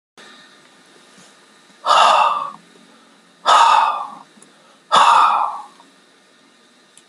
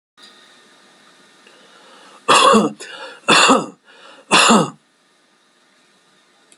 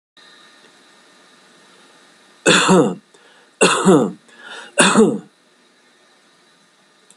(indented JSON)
{
  "exhalation_length": "7.1 s",
  "exhalation_amplitude": 30446,
  "exhalation_signal_mean_std_ratio": 0.43,
  "cough_length": "6.6 s",
  "cough_amplitude": 32767,
  "cough_signal_mean_std_ratio": 0.37,
  "three_cough_length": "7.2 s",
  "three_cough_amplitude": 32768,
  "three_cough_signal_mean_std_ratio": 0.37,
  "survey_phase": "beta (2021-08-13 to 2022-03-07)",
  "age": "65+",
  "gender": "Male",
  "wearing_mask": "No",
  "symptom_cough_any": true,
  "symptom_runny_or_blocked_nose": true,
  "smoker_status": "Never smoked",
  "respiratory_condition_asthma": false,
  "respiratory_condition_other": true,
  "recruitment_source": "REACT",
  "submission_delay": "2 days",
  "covid_test_result": "Negative",
  "covid_test_method": "RT-qPCR",
  "influenza_a_test_result": "Negative",
  "influenza_b_test_result": "Negative"
}